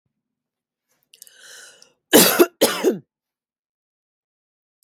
cough_length: 4.8 s
cough_amplitude: 32767
cough_signal_mean_std_ratio: 0.26
survey_phase: beta (2021-08-13 to 2022-03-07)
age: 18-44
gender: Female
wearing_mask: 'No'
symptom_cough_any: true
symptom_runny_or_blocked_nose: true
smoker_status: Never smoked
respiratory_condition_asthma: false
respiratory_condition_other: false
recruitment_source: REACT
submission_delay: 2 days
covid_test_result: Negative
covid_test_method: RT-qPCR
influenza_a_test_result: Negative
influenza_b_test_result: Negative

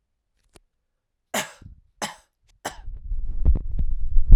three_cough_length: 4.4 s
three_cough_amplitude: 32768
three_cough_signal_mean_std_ratio: 0.39
survey_phase: alpha (2021-03-01 to 2021-08-12)
age: 18-44
gender: Male
wearing_mask: 'No'
symptom_cough_any: true
symptom_shortness_of_breath: true
symptom_fatigue: true
symptom_onset: 3 days
smoker_status: Prefer not to say
respiratory_condition_asthma: false
respiratory_condition_other: false
recruitment_source: Test and Trace
submission_delay: 2 days
covid_test_result: Positive
covid_test_method: RT-qPCR
covid_ct_value: 32.2
covid_ct_gene: N gene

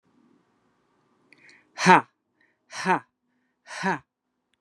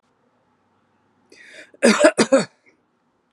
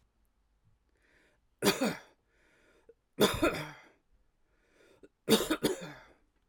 exhalation_length: 4.6 s
exhalation_amplitude: 32455
exhalation_signal_mean_std_ratio: 0.23
cough_length: 3.3 s
cough_amplitude: 32221
cough_signal_mean_std_ratio: 0.3
three_cough_length: 6.5 s
three_cough_amplitude: 9387
three_cough_signal_mean_std_ratio: 0.32
survey_phase: alpha (2021-03-01 to 2021-08-12)
age: 45-64
gender: Female
wearing_mask: 'No'
symptom_none: true
smoker_status: Ex-smoker
respiratory_condition_asthma: true
respiratory_condition_other: false
recruitment_source: REACT
submission_delay: 4 days
covid_test_result: Negative
covid_test_method: RT-qPCR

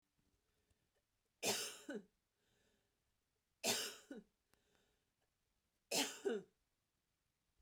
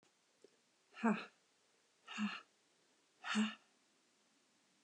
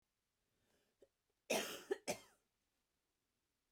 three_cough_length: 7.6 s
three_cough_amplitude: 1874
three_cough_signal_mean_std_ratio: 0.31
exhalation_length: 4.8 s
exhalation_amplitude: 3033
exhalation_signal_mean_std_ratio: 0.32
cough_length: 3.7 s
cough_amplitude: 1741
cough_signal_mean_std_ratio: 0.26
survey_phase: beta (2021-08-13 to 2022-03-07)
age: 18-44
gender: Female
wearing_mask: 'No'
symptom_cough_any: true
symptom_runny_or_blocked_nose: true
symptom_fatigue: true
symptom_onset: 12 days
smoker_status: Ex-smoker
respiratory_condition_asthma: false
respiratory_condition_other: false
recruitment_source: REACT
submission_delay: 1 day
covid_test_result: Negative
covid_test_method: RT-qPCR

